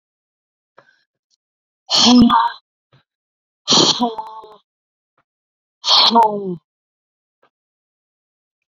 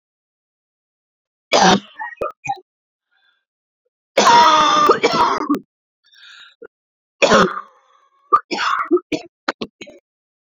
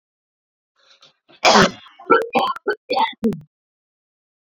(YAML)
exhalation_length: 8.8 s
exhalation_amplitude: 32768
exhalation_signal_mean_std_ratio: 0.35
three_cough_length: 10.6 s
three_cough_amplitude: 31387
three_cough_signal_mean_std_ratio: 0.41
cough_length: 4.5 s
cough_amplitude: 29746
cough_signal_mean_std_ratio: 0.37
survey_phase: beta (2021-08-13 to 2022-03-07)
age: 45-64
gender: Female
wearing_mask: 'No'
symptom_cough_any: true
symptom_sore_throat: true
symptom_fatigue: true
symptom_change_to_sense_of_smell_or_taste: true
symptom_loss_of_taste: true
symptom_onset: 13 days
smoker_status: Ex-smoker
respiratory_condition_asthma: false
respiratory_condition_other: false
recruitment_source: REACT
submission_delay: 1 day
covid_test_result: Negative
covid_test_method: RT-qPCR